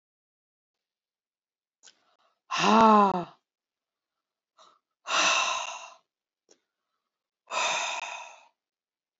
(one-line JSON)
{"exhalation_length": "9.2 s", "exhalation_amplitude": 16029, "exhalation_signal_mean_std_ratio": 0.32, "survey_phase": "beta (2021-08-13 to 2022-03-07)", "age": "45-64", "gender": "Female", "wearing_mask": "No", "symptom_none": true, "smoker_status": "Never smoked", "respiratory_condition_asthma": false, "respiratory_condition_other": false, "recruitment_source": "REACT", "submission_delay": "1 day", "covid_test_result": "Negative", "covid_test_method": "RT-qPCR", "influenza_a_test_result": "Negative", "influenza_b_test_result": "Negative"}